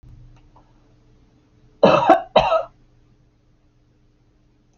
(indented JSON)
{
  "cough_length": "4.8 s",
  "cough_amplitude": 27808,
  "cough_signal_mean_std_ratio": 0.29,
  "survey_phase": "alpha (2021-03-01 to 2021-08-12)",
  "age": "65+",
  "gender": "Female",
  "wearing_mask": "No",
  "symptom_none": true,
  "smoker_status": "Ex-smoker",
  "respiratory_condition_asthma": false,
  "respiratory_condition_other": false,
  "recruitment_source": "REACT",
  "submission_delay": "2 days",
  "covid_test_result": "Negative",
  "covid_test_method": "RT-qPCR"
}